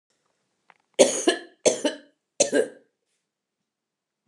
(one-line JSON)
{"cough_length": "4.3 s", "cough_amplitude": 28373, "cough_signal_mean_std_ratio": 0.3, "survey_phase": "alpha (2021-03-01 to 2021-08-12)", "age": "65+", "gender": "Female", "wearing_mask": "No", "symptom_fatigue": true, "smoker_status": "Never smoked", "respiratory_condition_asthma": true, "respiratory_condition_other": false, "recruitment_source": "REACT", "submission_delay": "2 days", "covid_test_result": "Negative", "covid_test_method": "RT-qPCR"}